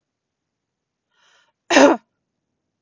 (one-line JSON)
{"cough_length": "2.8 s", "cough_amplitude": 32768, "cough_signal_mean_std_ratio": 0.22, "survey_phase": "beta (2021-08-13 to 2022-03-07)", "age": "18-44", "gender": "Female", "wearing_mask": "No", "symptom_none": true, "smoker_status": "Never smoked", "respiratory_condition_asthma": false, "respiratory_condition_other": false, "recruitment_source": "REACT", "submission_delay": "2 days", "covid_test_result": "Negative", "covid_test_method": "RT-qPCR", "influenza_a_test_result": "Negative", "influenza_b_test_result": "Negative"}